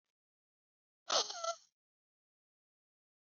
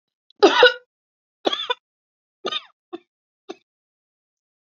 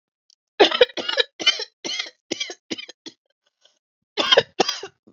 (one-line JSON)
{"exhalation_length": "3.2 s", "exhalation_amplitude": 3850, "exhalation_signal_mean_std_ratio": 0.24, "three_cough_length": "4.6 s", "three_cough_amplitude": 30982, "three_cough_signal_mean_std_ratio": 0.24, "cough_length": "5.1 s", "cough_amplitude": 30152, "cough_signal_mean_std_ratio": 0.33, "survey_phase": "beta (2021-08-13 to 2022-03-07)", "age": "45-64", "gender": "Female", "wearing_mask": "No", "symptom_new_continuous_cough": true, "symptom_shortness_of_breath": true, "symptom_sore_throat": true, "symptom_fatigue": true, "symptom_change_to_sense_of_smell_or_taste": true, "symptom_onset": "12 days", "smoker_status": "Never smoked", "respiratory_condition_asthma": true, "respiratory_condition_other": false, "recruitment_source": "REACT", "submission_delay": "2 days", "covid_test_method": "RT-qPCR", "influenza_a_test_result": "Unknown/Void", "influenza_b_test_result": "Unknown/Void"}